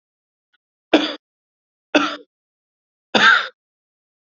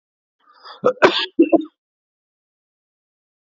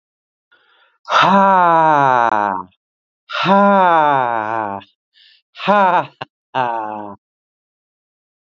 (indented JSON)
{
  "three_cough_length": "4.4 s",
  "three_cough_amplitude": 28774,
  "three_cough_signal_mean_std_ratio": 0.29,
  "cough_length": "3.4 s",
  "cough_amplitude": 27551,
  "cough_signal_mean_std_ratio": 0.28,
  "exhalation_length": "8.4 s",
  "exhalation_amplitude": 32767,
  "exhalation_signal_mean_std_ratio": 0.51,
  "survey_phase": "beta (2021-08-13 to 2022-03-07)",
  "age": "18-44",
  "gender": "Male",
  "wearing_mask": "No",
  "symptom_none": true,
  "smoker_status": "Never smoked",
  "respiratory_condition_asthma": false,
  "respiratory_condition_other": false,
  "recruitment_source": "REACT",
  "submission_delay": "6 days",
  "covid_test_result": "Negative",
  "covid_test_method": "RT-qPCR",
  "influenza_a_test_result": "Negative",
  "influenza_b_test_result": "Negative"
}